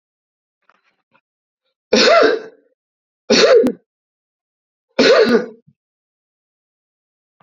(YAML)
three_cough_length: 7.4 s
three_cough_amplitude: 30796
three_cough_signal_mean_std_ratio: 0.36
survey_phase: beta (2021-08-13 to 2022-03-07)
age: 45-64
gender: Male
wearing_mask: 'No'
symptom_cough_any: true
symptom_runny_or_blocked_nose: true
symptom_shortness_of_breath: true
symptom_diarrhoea: true
symptom_headache: true
symptom_change_to_sense_of_smell_or_taste: true
smoker_status: Never smoked
respiratory_condition_asthma: false
respiratory_condition_other: false
recruitment_source: Test and Trace
submission_delay: 1 day
covid_test_result: Positive
covid_test_method: RT-qPCR